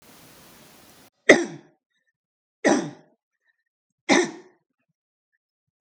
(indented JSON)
{
  "three_cough_length": "5.8 s",
  "three_cough_amplitude": 32768,
  "three_cough_signal_mean_std_ratio": 0.23,
  "survey_phase": "beta (2021-08-13 to 2022-03-07)",
  "age": "18-44",
  "gender": "Male",
  "wearing_mask": "No",
  "symptom_none": true,
  "smoker_status": "Never smoked",
  "respiratory_condition_asthma": false,
  "respiratory_condition_other": false,
  "recruitment_source": "REACT",
  "submission_delay": "2 days",
  "covid_test_result": "Negative",
  "covid_test_method": "RT-qPCR",
  "influenza_a_test_result": "Negative",
  "influenza_b_test_result": "Negative"
}